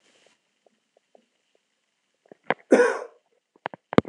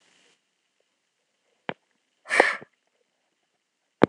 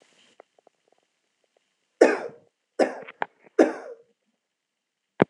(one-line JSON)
{"cough_length": "4.1 s", "cough_amplitude": 26028, "cough_signal_mean_std_ratio": 0.2, "exhalation_length": "4.1 s", "exhalation_amplitude": 26028, "exhalation_signal_mean_std_ratio": 0.16, "three_cough_length": "5.3 s", "three_cough_amplitude": 26028, "three_cough_signal_mean_std_ratio": 0.22, "survey_phase": "alpha (2021-03-01 to 2021-08-12)", "age": "45-64", "gender": "Male", "wearing_mask": "No", "symptom_none": true, "symptom_headache": true, "smoker_status": "Never smoked", "respiratory_condition_asthma": false, "respiratory_condition_other": false, "recruitment_source": "REACT", "submission_delay": "1 day", "covid_test_result": "Negative", "covid_test_method": "RT-qPCR"}